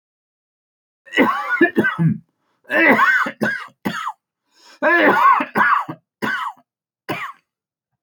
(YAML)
three_cough_length: 8.0 s
three_cough_amplitude: 28475
three_cough_signal_mean_std_ratio: 0.53
survey_phase: beta (2021-08-13 to 2022-03-07)
age: 45-64
gender: Male
wearing_mask: 'No'
symptom_none: true
smoker_status: Never smoked
respiratory_condition_asthma: false
respiratory_condition_other: false
recruitment_source: REACT
submission_delay: 3 days
covid_test_result: Negative
covid_test_method: RT-qPCR
influenza_a_test_result: Negative
influenza_b_test_result: Negative